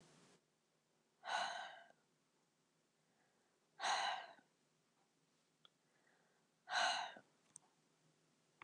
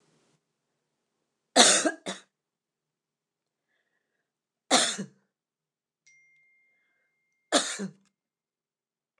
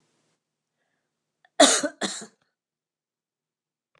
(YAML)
exhalation_length: 8.6 s
exhalation_amplitude: 1527
exhalation_signal_mean_std_ratio: 0.33
three_cough_length: 9.2 s
three_cough_amplitude: 24772
three_cough_signal_mean_std_ratio: 0.23
cough_length: 4.0 s
cough_amplitude: 28669
cough_signal_mean_std_ratio: 0.21
survey_phase: alpha (2021-03-01 to 2021-08-12)
age: 65+
gender: Female
wearing_mask: 'No'
symptom_headache: true
symptom_onset: 12 days
smoker_status: Never smoked
respiratory_condition_asthma: false
respiratory_condition_other: false
recruitment_source: REACT
submission_delay: 7 days
covid_test_result: Negative
covid_test_method: RT-qPCR